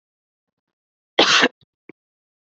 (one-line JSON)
{"cough_length": "2.5 s", "cough_amplitude": 29903, "cough_signal_mean_std_ratio": 0.27, "survey_phase": "beta (2021-08-13 to 2022-03-07)", "age": "18-44", "gender": "Female", "wearing_mask": "No", "symptom_runny_or_blocked_nose": true, "symptom_sore_throat": true, "symptom_diarrhoea": true, "symptom_fatigue": true, "symptom_onset": "4 days", "smoker_status": "Never smoked", "respiratory_condition_asthma": false, "respiratory_condition_other": false, "recruitment_source": "Test and Trace", "submission_delay": "1 day", "covid_test_result": "Positive", "covid_test_method": "RT-qPCR", "covid_ct_value": 18.9, "covid_ct_gene": "ORF1ab gene", "covid_ct_mean": 19.5, "covid_viral_load": "410000 copies/ml", "covid_viral_load_category": "Low viral load (10K-1M copies/ml)"}